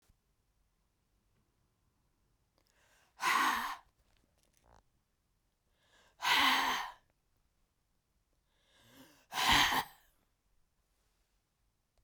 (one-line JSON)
{"exhalation_length": "12.0 s", "exhalation_amplitude": 6378, "exhalation_signal_mean_std_ratio": 0.3, "survey_phase": "beta (2021-08-13 to 2022-03-07)", "age": "45-64", "gender": "Female", "wearing_mask": "No", "symptom_cough_any": true, "symptom_runny_or_blocked_nose": true, "symptom_sore_throat": true, "symptom_fatigue": true, "smoker_status": "Ex-smoker", "respiratory_condition_asthma": false, "respiratory_condition_other": false, "recruitment_source": "Test and Trace", "submission_delay": "2 days", "covid_test_result": "Positive", "covid_test_method": "RT-qPCR", "covid_ct_value": 31.8, "covid_ct_gene": "ORF1ab gene", "covid_ct_mean": 32.2, "covid_viral_load": "28 copies/ml", "covid_viral_load_category": "Minimal viral load (< 10K copies/ml)"}